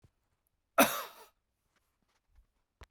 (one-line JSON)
{"cough_length": "2.9 s", "cough_amplitude": 10666, "cough_signal_mean_std_ratio": 0.19, "survey_phase": "beta (2021-08-13 to 2022-03-07)", "age": "45-64", "gender": "Male", "wearing_mask": "No", "symptom_cough_any": true, "symptom_runny_or_blocked_nose": true, "symptom_fatigue": true, "symptom_change_to_sense_of_smell_or_taste": true, "symptom_onset": "3 days", "smoker_status": "Ex-smoker", "respiratory_condition_asthma": false, "respiratory_condition_other": false, "recruitment_source": "Test and Trace", "submission_delay": "1 day", "covid_test_result": "Positive", "covid_test_method": "RT-qPCR"}